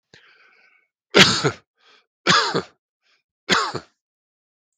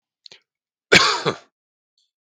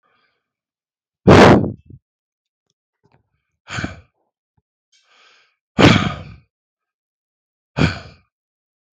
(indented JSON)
{
  "three_cough_length": "4.8 s",
  "three_cough_amplitude": 32768,
  "three_cough_signal_mean_std_ratio": 0.32,
  "cough_length": "2.3 s",
  "cough_amplitude": 32768,
  "cough_signal_mean_std_ratio": 0.28,
  "exhalation_length": "9.0 s",
  "exhalation_amplitude": 32768,
  "exhalation_signal_mean_std_ratio": 0.25,
  "survey_phase": "beta (2021-08-13 to 2022-03-07)",
  "age": "45-64",
  "gender": "Male",
  "wearing_mask": "No",
  "symptom_cough_any": true,
  "symptom_runny_or_blocked_nose": true,
  "symptom_shortness_of_breath": true,
  "symptom_fatigue": true,
  "symptom_onset": "5 days",
  "smoker_status": "Ex-smoker",
  "respiratory_condition_asthma": false,
  "respiratory_condition_other": false,
  "recruitment_source": "REACT",
  "submission_delay": "0 days",
  "covid_test_result": "Positive",
  "covid_test_method": "RT-qPCR",
  "covid_ct_value": 18.0,
  "covid_ct_gene": "E gene",
  "influenza_a_test_result": "Negative",
  "influenza_b_test_result": "Negative"
}